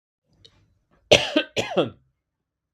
{
  "cough_length": "2.7 s",
  "cough_amplitude": 32768,
  "cough_signal_mean_std_ratio": 0.29,
  "survey_phase": "beta (2021-08-13 to 2022-03-07)",
  "age": "18-44",
  "gender": "Male",
  "wearing_mask": "No",
  "symptom_none": true,
  "smoker_status": "Never smoked",
  "respiratory_condition_asthma": false,
  "respiratory_condition_other": false,
  "recruitment_source": "Test and Trace",
  "submission_delay": "1 day",
  "covid_test_result": "Positive",
  "covid_test_method": "RT-qPCR",
  "covid_ct_value": 18.1,
  "covid_ct_gene": "ORF1ab gene",
  "covid_ct_mean": 18.5,
  "covid_viral_load": "830000 copies/ml",
  "covid_viral_load_category": "Low viral load (10K-1M copies/ml)"
}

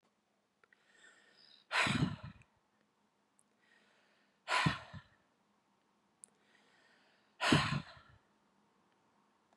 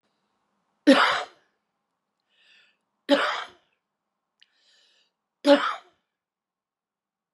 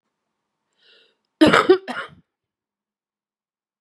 {
  "exhalation_length": "9.6 s",
  "exhalation_amplitude": 7146,
  "exhalation_signal_mean_std_ratio": 0.29,
  "three_cough_length": "7.3 s",
  "three_cough_amplitude": 20827,
  "three_cough_signal_mean_std_ratio": 0.25,
  "cough_length": "3.8 s",
  "cough_amplitude": 32767,
  "cough_signal_mean_std_ratio": 0.24,
  "survey_phase": "beta (2021-08-13 to 2022-03-07)",
  "age": "45-64",
  "gender": "Female",
  "wearing_mask": "No",
  "symptom_cough_any": true,
  "symptom_runny_or_blocked_nose": true,
  "symptom_fatigue": true,
  "symptom_onset": "9 days",
  "smoker_status": "Current smoker (e-cigarettes or vapes only)",
  "respiratory_condition_asthma": false,
  "respiratory_condition_other": false,
  "recruitment_source": "REACT",
  "submission_delay": "1 day",
  "covid_test_result": "Negative",
  "covid_test_method": "RT-qPCR",
  "influenza_a_test_result": "Negative",
  "influenza_b_test_result": "Negative"
}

